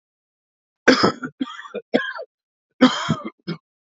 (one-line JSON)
{"three_cough_length": "3.9 s", "three_cough_amplitude": 28464, "three_cough_signal_mean_std_ratio": 0.35, "survey_phase": "beta (2021-08-13 to 2022-03-07)", "age": "18-44", "gender": "Male", "wearing_mask": "No", "symptom_cough_any": true, "symptom_runny_or_blocked_nose": true, "symptom_shortness_of_breath": true, "symptom_sore_throat": true, "symptom_other": true, "symptom_onset": "6 days", "smoker_status": "Current smoker (1 to 10 cigarettes per day)", "respiratory_condition_asthma": false, "respiratory_condition_other": false, "recruitment_source": "Test and Trace", "submission_delay": "3 days", "covid_test_result": "Positive", "covid_test_method": "RT-qPCR", "covid_ct_value": 23.1, "covid_ct_gene": "N gene", "covid_ct_mean": 23.2, "covid_viral_load": "24000 copies/ml", "covid_viral_load_category": "Low viral load (10K-1M copies/ml)"}